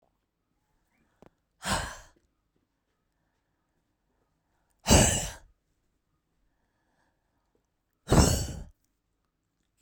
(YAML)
exhalation_length: 9.8 s
exhalation_amplitude: 17465
exhalation_signal_mean_std_ratio: 0.24
survey_phase: beta (2021-08-13 to 2022-03-07)
age: 45-64
gender: Female
wearing_mask: 'No'
symptom_none: true
smoker_status: Ex-smoker
respiratory_condition_asthma: false
respiratory_condition_other: false
recruitment_source: REACT
submission_delay: 6 days
covid_test_result: Negative
covid_test_method: RT-qPCR